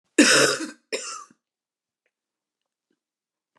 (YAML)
cough_length: 3.6 s
cough_amplitude: 25364
cough_signal_mean_std_ratio: 0.3
survey_phase: beta (2021-08-13 to 2022-03-07)
age: 65+
gender: Female
wearing_mask: 'No'
symptom_cough_any: true
symptom_runny_or_blocked_nose: true
symptom_onset: 6 days
smoker_status: Never smoked
respiratory_condition_asthma: false
respiratory_condition_other: false
recruitment_source: REACT
submission_delay: 1 day
covid_test_result: Negative
covid_test_method: RT-qPCR
influenza_a_test_result: Negative
influenza_b_test_result: Negative